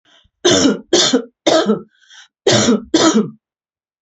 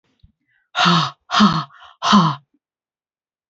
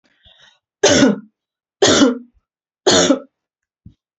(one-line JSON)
{"cough_length": "4.0 s", "cough_amplitude": 32527, "cough_signal_mean_std_ratio": 0.56, "exhalation_length": "3.5 s", "exhalation_amplitude": 28527, "exhalation_signal_mean_std_ratio": 0.42, "three_cough_length": "4.2 s", "three_cough_amplitude": 30366, "three_cough_signal_mean_std_ratio": 0.41, "survey_phase": "alpha (2021-03-01 to 2021-08-12)", "age": "45-64", "gender": "Female", "wearing_mask": "No", "symptom_none": true, "smoker_status": "Ex-smoker", "respiratory_condition_asthma": false, "respiratory_condition_other": false, "recruitment_source": "REACT", "submission_delay": "3 days", "covid_test_result": "Negative", "covid_test_method": "RT-qPCR"}